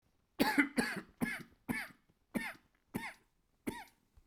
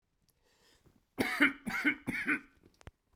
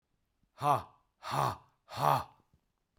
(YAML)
cough_length: 4.3 s
cough_amplitude: 5765
cough_signal_mean_std_ratio: 0.4
three_cough_length: 3.2 s
three_cough_amplitude: 8097
three_cough_signal_mean_std_ratio: 0.4
exhalation_length: 3.0 s
exhalation_amplitude: 7425
exhalation_signal_mean_std_ratio: 0.38
survey_phase: alpha (2021-03-01 to 2021-08-12)
age: 45-64
gender: Male
wearing_mask: 'No'
symptom_cough_any: true
symptom_fatigue: true
symptom_onset: 3 days
smoker_status: Never smoked
respiratory_condition_asthma: false
respiratory_condition_other: false
recruitment_source: Test and Trace
submission_delay: 2 days
covid_test_result: Positive
covid_test_method: RT-qPCR